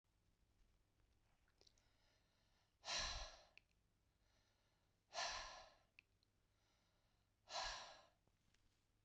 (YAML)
exhalation_length: 9.0 s
exhalation_amplitude: 780
exhalation_signal_mean_std_ratio: 0.35
survey_phase: beta (2021-08-13 to 2022-03-07)
age: 45-64
gender: Female
wearing_mask: 'No'
symptom_change_to_sense_of_smell_or_taste: true
symptom_loss_of_taste: true
symptom_onset: 6 days
smoker_status: Never smoked
respiratory_condition_asthma: true
respiratory_condition_other: false
recruitment_source: Test and Trace
submission_delay: 2 days
covid_test_result: Positive
covid_test_method: RT-qPCR